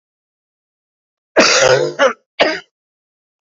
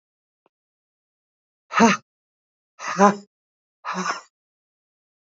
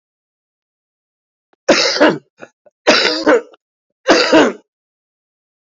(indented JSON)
{
  "cough_length": "3.4 s",
  "cough_amplitude": 31239,
  "cough_signal_mean_std_ratio": 0.4,
  "exhalation_length": "5.3 s",
  "exhalation_amplitude": 27744,
  "exhalation_signal_mean_std_ratio": 0.25,
  "three_cough_length": "5.7 s",
  "three_cough_amplitude": 32767,
  "three_cough_signal_mean_std_ratio": 0.4,
  "survey_phase": "alpha (2021-03-01 to 2021-08-12)",
  "age": "45-64",
  "gender": "Female",
  "wearing_mask": "No",
  "symptom_none": true,
  "smoker_status": "Current smoker (e-cigarettes or vapes only)",
  "respiratory_condition_asthma": true,
  "respiratory_condition_other": false,
  "recruitment_source": "REACT",
  "submission_delay": "3 days",
  "covid_test_result": "Negative",
  "covid_test_method": "RT-qPCR"
}